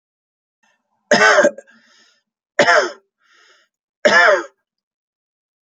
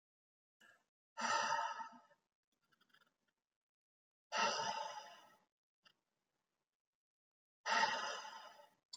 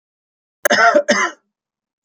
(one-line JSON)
{"three_cough_length": "5.6 s", "three_cough_amplitude": 29519, "three_cough_signal_mean_std_ratio": 0.36, "exhalation_length": "9.0 s", "exhalation_amplitude": 2511, "exhalation_signal_mean_std_ratio": 0.38, "cough_length": "2.0 s", "cough_amplitude": 29725, "cough_signal_mean_std_ratio": 0.42, "survey_phase": "beta (2021-08-13 to 2022-03-07)", "age": "45-64", "gender": "Male", "wearing_mask": "No", "symptom_none": true, "smoker_status": "Never smoked", "respiratory_condition_asthma": false, "respiratory_condition_other": false, "recruitment_source": "Test and Trace", "submission_delay": "1 day", "covid_test_result": "Negative", "covid_test_method": "RT-qPCR"}